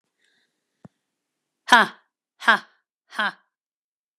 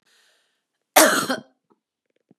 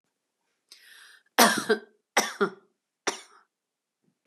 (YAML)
exhalation_length: 4.2 s
exhalation_amplitude: 32768
exhalation_signal_mean_std_ratio: 0.2
cough_length: 2.4 s
cough_amplitude: 32767
cough_signal_mean_std_ratio: 0.28
three_cough_length: 4.3 s
three_cough_amplitude: 25681
three_cough_signal_mean_std_ratio: 0.28
survey_phase: beta (2021-08-13 to 2022-03-07)
age: 18-44
gender: Female
wearing_mask: 'No'
symptom_cough_any: true
symptom_runny_or_blocked_nose: true
symptom_sore_throat: true
symptom_onset: 1 day
smoker_status: Never smoked
respiratory_condition_asthma: true
respiratory_condition_other: false
recruitment_source: Test and Trace
submission_delay: 1 day
covid_test_result: Negative
covid_test_method: ePCR